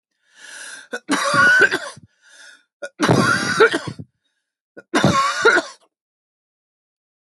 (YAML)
three_cough_length: 7.3 s
three_cough_amplitude: 32768
three_cough_signal_mean_std_ratio: 0.47
survey_phase: alpha (2021-03-01 to 2021-08-12)
age: 45-64
gender: Female
wearing_mask: 'No'
symptom_none: true
smoker_status: Never smoked
respiratory_condition_asthma: false
respiratory_condition_other: false
recruitment_source: REACT
submission_delay: 3 days
covid_test_result: Negative
covid_test_method: RT-qPCR